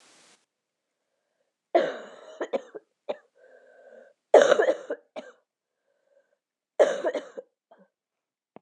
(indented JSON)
{
  "three_cough_length": "8.6 s",
  "three_cough_amplitude": 26298,
  "three_cough_signal_mean_std_ratio": 0.26,
  "survey_phase": "beta (2021-08-13 to 2022-03-07)",
  "age": "18-44",
  "gender": "Female",
  "wearing_mask": "No",
  "symptom_cough_any": true,
  "symptom_runny_or_blocked_nose": true,
  "symptom_shortness_of_breath": true,
  "symptom_sore_throat": true,
  "symptom_fatigue": true,
  "symptom_fever_high_temperature": true,
  "symptom_headache": true,
  "symptom_onset": "1 day",
  "smoker_status": "Ex-smoker",
  "respiratory_condition_asthma": false,
  "respiratory_condition_other": false,
  "recruitment_source": "Test and Trace",
  "submission_delay": "1 day",
  "covid_test_result": "Positive",
  "covid_test_method": "RT-qPCR",
  "covid_ct_value": 20.3,
  "covid_ct_gene": "N gene"
}